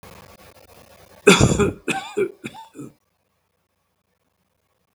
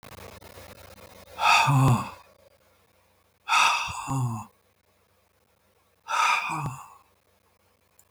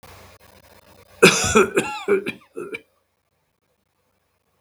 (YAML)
three_cough_length: 4.9 s
three_cough_amplitude: 32768
three_cough_signal_mean_std_ratio: 0.29
exhalation_length: 8.1 s
exhalation_amplitude: 13742
exhalation_signal_mean_std_ratio: 0.43
cough_length: 4.6 s
cough_amplitude: 32768
cough_signal_mean_std_ratio: 0.32
survey_phase: beta (2021-08-13 to 2022-03-07)
age: 65+
gender: Male
wearing_mask: 'No'
symptom_none: true
smoker_status: Ex-smoker
respiratory_condition_asthma: false
respiratory_condition_other: false
recruitment_source: REACT
submission_delay: 3 days
covid_test_result: Negative
covid_test_method: RT-qPCR
influenza_a_test_result: Negative
influenza_b_test_result: Negative